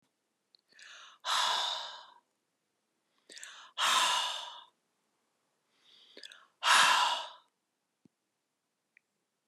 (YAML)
exhalation_length: 9.5 s
exhalation_amplitude: 8887
exhalation_signal_mean_std_ratio: 0.36
survey_phase: beta (2021-08-13 to 2022-03-07)
age: 45-64
gender: Female
wearing_mask: 'No'
symptom_fatigue: true
smoker_status: Never smoked
respiratory_condition_asthma: false
respiratory_condition_other: false
recruitment_source: REACT
submission_delay: 3 days
covid_test_result: Negative
covid_test_method: RT-qPCR